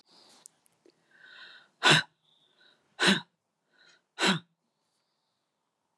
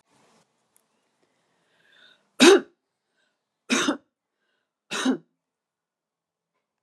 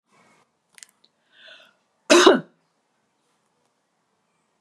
{
  "exhalation_length": "6.0 s",
  "exhalation_amplitude": 12312,
  "exhalation_signal_mean_std_ratio": 0.25,
  "three_cough_length": "6.8 s",
  "three_cough_amplitude": 29500,
  "three_cough_signal_mean_std_ratio": 0.22,
  "cough_length": "4.6 s",
  "cough_amplitude": 32767,
  "cough_signal_mean_std_ratio": 0.2,
  "survey_phase": "alpha (2021-03-01 to 2021-08-12)",
  "age": "65+",
  "gender": "Female",
  "wearing_mask": "No",
  "symptom_none": true,
  "smoker_status": "Never smoked",
  "respiratory_condition_asthma": false,
  "respiratory_condition_other": false,
  "recruitment_source": "REACT",
  "submission_delay": "1 day",
  "covid_test_result": "Negative",
  "covid_test_method": "RT-qPCR"
}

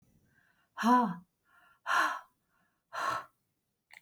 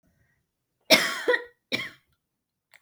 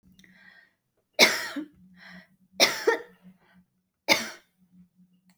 {
  "exhalation_length": "4.0 s",
  "exhalation_amplitude": 6608,
  "exhalation_signal_mean_std_ratio": 0.37,
  "cough_length": "2.8 s",
  "cough_amplitude": 29765,
  "cough_signal_mean_std_ratio": 0.3,
  "three_cough_length": "5.4 s",
  "three_cough_amplitude": 24454,
  "three_cough_signal_mean_std_ratio": 0.29,
  "survey_phase": "beta (2021-08-13 to 2022-03-07)",
  "age": "45-64",
  "gender": "Female",
  "wearing_mask": "No",
  "symptom_cough_any": true,
  "symptom_sore_throat": true,
  "symptom_onset": "5 days",
  "smoker_status": "Never smoked",
  "respiratory_condition_asthma": false,
  "respiratory_condition_other": false,
  "recruitment_source": "REACT",
  "submission_delay": "2 days",
  "covid_test_result": "Negative",
  "covid_test_method": "RT-qPCR"
}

